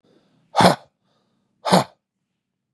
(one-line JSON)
{"exhalation_length": "2.7 s", "exhalation_amplitude": 31642, "exhalation_signal_mean_std_ratio": 0.27, "survey_phase": "beta (2021-08-13 to 2022-03-07)", "age": "45-64", "gender": "Male", "wearing_mask": "No", "symptom_none": true, "smoker_status": "Never smoked", "respiratory_condition_asthma": false, "respiratory_condition_other": false, "recruitment_source": "REACT", "submission_delay": "0 days", "covid_test_result": "Negative", "covid_test_method": "RT-qPCR", "influenza_a_test_result": "Negative", "influenza_b_test_result": "Negative"}